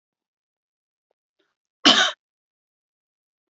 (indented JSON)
{
  "three_cough_length": "3.5 s",
  "three_cough_amplitude": 30190,
  "three_cough_signal_mean_std_ratio": 0.2,
  "survey_phase": "alpha (2021-03-01 to 2021-08-12)",
  "age": "45-64",
  "gender": "Female",
  "wearing_mask": "No",
  "symptom_none": true,
  "symptom_onset": "12 days",
  "smoker_status": "Never smoked",
  "respiratory_condition_asthma": false,
  "respiratory_condition_other": false,
  "recruitment_source": "REACT",
  "submission_delay": "2 days",
  "covid_test_result": "Negative",
  "covid_test_method": "RT-qPCR"
}